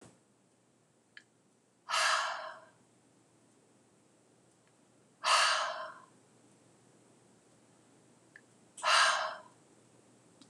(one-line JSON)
{"exhalation_length": "10.5 s", "exhalation_amplitude": 6562, "exhalation_signal_mean_std_ratio": 0.33, "survey_phase": "beta (2021-08-13 to 2022-03-07)", "age": "45-64", "gender": "Female", "wearing_mask": "No", "symptom_none": true, "smoker_status": "Never smoked", "respiratory_condition_asthma": false, "respiratory_condition_other": false, "recruitment_source": "REACT", "submission_delay": "3 days", "covid_test_result": "Negative", "covid_test_method": "RT-qPCR", "influenza_a_test_result": "Negative", "influenza_b_test_result": "Negative"}